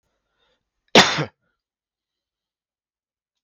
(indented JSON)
{
  "cough_length": "3.4 s",
  "cough_amplitude": 32767,
  "cough_signal_mean_std_ratio": 0.18,
  "survey_phase": "beta (2021-08-13 to 2022-03-07)",
  "age": "45-64",
  "gender": "Male",
  "wearing_mask": "No",
  "symptom_none": true,
  "smoker_status": "Never smoked",
  "respiratory_condition_asthma": false,
  "respiratory_condition_other": false,
  "recruitment_source": "Test and Trace",
  "submission_delay": "0 days",
  "covid_test_result": "Negative",
  "covid_test_method": "LFT"
}